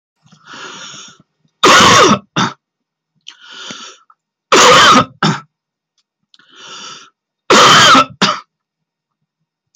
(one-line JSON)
{"three_cough_length": "9.8 s", "three_cough_amplitude": 32768, "three_cough_signal_mean_std_ratio": 0.44, "survey_phase": "beta (2021-08-13 to 2022-03-07)", "age": "45-64", "gender": "Male", "wearing_mask": "No", "symptom_none": true, "smoker_status": "Never smoked", "respiratory_condition_asthma": true, "respiratory_condition_other": false, "recruitment_source": "REACT", "submission_delay": "2 days", "covid_test_result": "Negative", "covid_test_method": "RT-qPCR", "influenza_a_test_result": "Negative", "influenza_b_test_result": "Negative"}